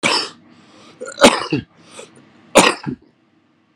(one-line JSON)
{"three_cough_length": "3.8 s", "three_cough_amplitude": 32768, "three_cough_signal_mean_std_ratio": 0.35, "survey_phase": "beta (2021-08-13 to 2022-03-07)", "age": "45-64", "gender": "Male", "wearing_mask": "No", "symptom_none": true, "smoker_status": "Ex-smoker", "respiratory_condition_asthma": false, "respiratory_condition_other": true, "recruitment_source": "REACT", "submission_delay": "1 day", "covid_test_result": "Negative", "covid_test_method": "RT-qPCR"}